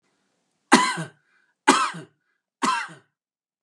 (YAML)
three_cough_length: 3.6 s
three_cough_amplitude: 32767
three_cough_signal_mean_std_ratio: 0.33
survey_phase: beta (2021-08-13 to 2022-03-07)
age: 45-64
gender: Male
wearing_mask: 'No'
symptom_none: true
smoker_status: Never smoked
respiratory_condition_asthma: false
respiratory_condition_other: false
recruitment_source: REACT
submission_delay: 2 days
covid_test_result: Negative
covid_test_method: RT-qPCR
influenza_a_test_result: Negative
influenza_b_test_result: Negative